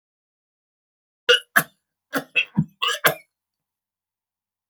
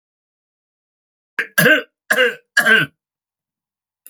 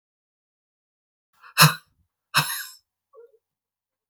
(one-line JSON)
{"cough_length": "4.7 s", "cough_amplitude": 28432, "cough_signal_mean_std_ratio": 0.26, "three_cough_length": "4.1 s", "three_cough_amplitude": 28864, "three_cough_signal_mean_std_ratio": 0.35, "exhalation_length": "4.1 s", "exhalation_amplitude": 32767, "exhalation_signal_mean_std_ratio": 0.21, "survey_phase": "beta (2021-08-13 to 2022-03-07)", "age": "45-64", "gender": "Male", "wearing_mask": "No", "symptom_cough_any": true, "symptom_runny_or_blocked_nose": true, "symptom_sore_throat": true, "symptom_change_to_sense_of_smell_or_taste": true, "symptom_onset": "13 days", "smoker_status": "Never smoked", "respiratory_condition_asthma": false, "respiratory_condition_other": false, "recruitment_source": "REACT", "submission_delay": "1 day", "covid_test_result": "Negative", "covid_test_method": "RT-qPCR", "influenza_a_test_result": "Negative", "influenza_b_test_result": "Negative"}